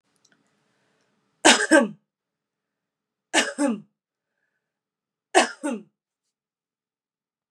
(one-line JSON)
{"three_cough_length": "7.5 s", "three_cough_amplitude": 32767, "three_cough_signal_mean_std_ratio": 0.26, "survey_phase": "beta (2021-08-13 to 2022-03-07)", "age": "45-64", "gender": "Female", "wearing_mask": "No", "symptom_none": true, "smoker_status": "Ex-smoker", "respiratory_condition_asthma": false, "respiratory_condition_other": false, "recruitment_source": "REACT", "submission_delay": "2 days", "covid_test_result": "Negative", "covid_test_method": "RT-qPCR", "influenza_a_test_result": "Negative", "influenza_b_test_result": "Negative"}